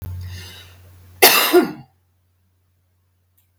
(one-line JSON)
{"cough_length": "3.6 s", "cough_amplitude": 32768, "cough_signal_mean_std_ratio": 0.33, "survey_phase": "beta (2021-08-13 to 2022-03-07)", "age": "45-64", "gender": "Female", "wearing_mask": "No", "symptom_none": true, "smoker_status": "Never smoked", "respiratory_condition_asthma": true, "respiratory_condition_other": false, "recruitment_source": "REACT", "submission_delay": "2 days", "covid_test_result": "Negative", "covid_test_method": "RT-qPCR", "influenza_a_test_result": "Negative", "influenza_b_test_result": "Negative"}